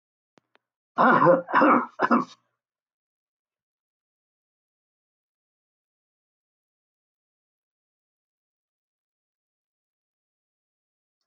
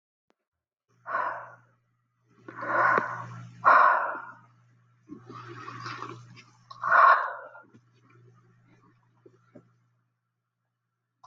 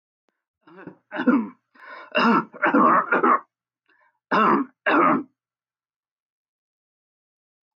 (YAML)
cough_length: 11.3 s
cough_amplitude: 18699
cough_signal_mean_std_ratio: 0.23
exhalation_length: 11.3 s
exhalation_amplitude: 16019
exhalation_signal_mean_std_ratio: 0.33
three_cough_length: 7.8 s
three_cough_amplitude: 15771
three_cough_signal_mean_std_ratio: 0.43
survey_phase: alpha (2021-03-01 to 2021-08-12)
age: 65+
gender: Male
wearing_mask: 'No'
symptom_none: true
smoker_status: Never smoked
respiratory_condition_asthma: false
respiratory_condition_other: false
recruitment_source: REACT
submission_delay: 4 days
covid_test_result: Negative
covid_test_method: RT-qPCR